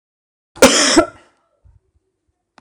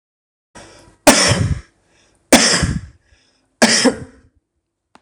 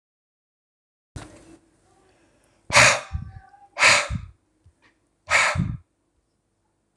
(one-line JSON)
{"cough_length": "2.6 s", "cough_amplitude": 26028, "cough_signal_mean_std_ratio": 0.32, "three_cough_length": "5.0 s", "three_cough_amplitude": 26028, "three_cough_signal_mean_std_ratio": 0.4, "exhalation_length": "7.0 s", "exhalation_amplitude": 26028, "exhalation_signal_mean_std_ratio": 0.31, "survey_phase": "beta (2021-08-13 to 2022-03-07)", "age": "45-64", "gender": "Male", "wearing_mask": "No", "symptom_cough_any": true, "symptom_runny_or_blocked_nose": true, "smoker_status": "Never smoked", "respiratory_condition_asthma": false, "respiratory_condition_other": false, "recruitment_source": "Test and Trace", "submission_delay": "1 day", "covid_test_result": "Positive", "covid_test_method": "RT-qPCR"}